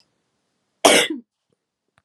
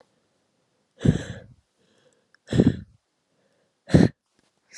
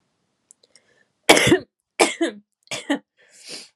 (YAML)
cough_length: 2.0 s
cough_amplitude: 32767
cough_signal_mean_std_ratio: 0.27
exhalation_length: 4.8 s
exhalation_amplitude: 24898
exhalation_signal_mean_std_ratio: 0.25
three_cough_length: 3.8 s
three_cough_amplitude: 32768
three_cough_signal_mean_std_ratio: 0.31
survey_phase: beta (2021-08-13 to 2022-03-07)
age: 18-44
gender: Female
wearing_mask: 'No'
symptom_fatigue: true
symptom_other: true
smoker_status: Never smoked
respiratory_condition_asthma: false
respiratory_condition_other: false
recruitment_source: Test and Trace
submission_delay: 2 days
covid_test_result: Positive
covid_test_method: LFT